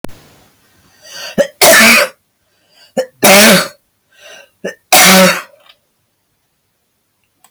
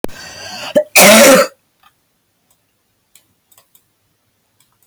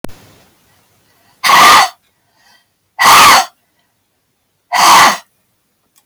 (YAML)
three_cough_length: 7.5 s
three_cough_amplitude: 32768
three_cough_signal_mean_std_ratio: 0.43
cough_length: 4.9 s
cough_amplitude: 32768
cough_signal_mean_std_ratio: 0.35
exhalation_length: 6.1 s
exhalation_amplitude: 32768
exhalation_signal_mean_std_ratio: 0.44
survey_phase: alpha (2021-03-01 to 2021-08-12)
age: 45-64
gender: Female
wearing_mask: 'No'
symptom_none: true
smoker_status: Current smoker (11 or more cigarettes per day)
respiratory_condition_asthma: false
respiratory_condition_other: true
recruitment_source: REACT
submission_delay: 2 days
covid_test_result: Negative
covid_test_method: RT-qPCR